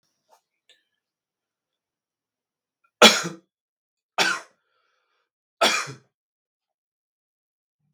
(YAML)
three_cough_length: 7.9 s
three_cough_amplitude: 32768
three_cough_signal_mean_std_ratio: 0.19
survey_phase: beta (2021-08-13 to 2022-03-07)
age: 45-64
gender: Male
wearing_mask: 'No'
symptom_none: true
smoker_status: Never smoked
respiratory_condition_asthma: false
respiratory_condition_other: false
recruitment_source: REACT
submission_delay: 3 days
covid_test_result: Negative
covid_test_method: RT-qPCR
influenza_a_test_result: Unknown/Void
influenza_b_test_result: Unknown/Void